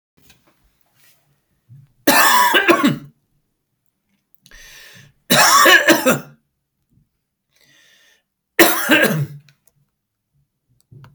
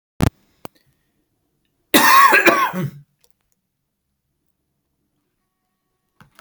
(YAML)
three_cough_length: 11.1 s
three_cough_amplitude: 32768
three_cough_signal_mean_std_ratio: 0.38
cough_length: 6.4 s
cough_amplitude: 32768
cough_signal_mean_std_ratio: 0.3
survey_phase: beta (2021-08-13 to 2022-03-07)
age: 65+
gender: Male
wearing_mask: 'No'
symptom_none: true
smoker_status: Never smoked
respiratory_condition_asthma: false
respiratory_condition_other: false
recruitment_source: REACT
submission_delay: 1 day
covid_test_result: Negative
covid_test_method: RT-qPCR
influenza_a_test_result: Negative
influenza_b_test_result: Negative